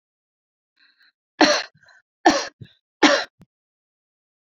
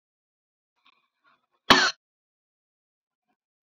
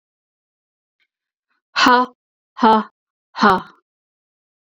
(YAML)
three_cough_length: 4.5 s
three_cough_amplitude: 28831
three_cough_signal_mean_std_ratio: 0.27
cough_length: 3.7 s
cough_amplitude: 27194
cough_signal_mean_std_ratio: 0.17
exhalation_length: 4.6 s
exhalation_amplitude: 29571
exhalation_signal_mean_std_ratio: 0.31
survey_phase: beta (2021-08-13 to 2022-03-07)
age: 45-64
gender: Female
wearing_mask: 'No'
symptom_none: true
smoker_status: Ex-smoker
respiratory_condition_asthma: false
respiratory_condition_other: false
recruitment_source: REACT
submission_delay: 3 days
covid_test_result: Negative
covid_test_method: RT-qPCR